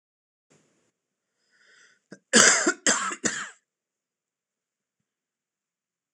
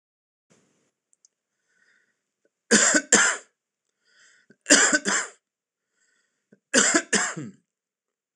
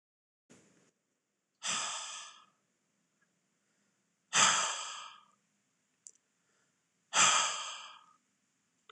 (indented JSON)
{
  "cough_length": "6.1 s",
  "cough_amplitude": 26027,
  "cough_signal_mean_std_ratio": 0.26,
  "three_cough_length": "8.4 s",
  "three_cough_amplitude": 25933,
  "three_cough_signal_mean_std_ratio": 0.33,
  "exhalation_length": "8.9 s",
  "exhalation_amplitude": 8785,
  "exhalation_signal_mean_std_ratio": 0.31,
  "survey_phase": "beta (2021-08-13 to 2022-03-07)",
  "age": "45-64",
  "gender": "Male",
  "wearing_mask": "No",
  "symptom_cough_any": true,
  "symptom_sore_throat": true,
  "symptom_onset": "6 days",
  "smoker_status": "Ex-smoker",
  "respiratory_condition_asthma": false,
  "respiratory_condition_other": false,
  "recruitment_source": "REACT",
  "submission_delay": "2 days",
  "covid_test_result": "Negative",
  "covid_test_method": "RT-qPCR"
}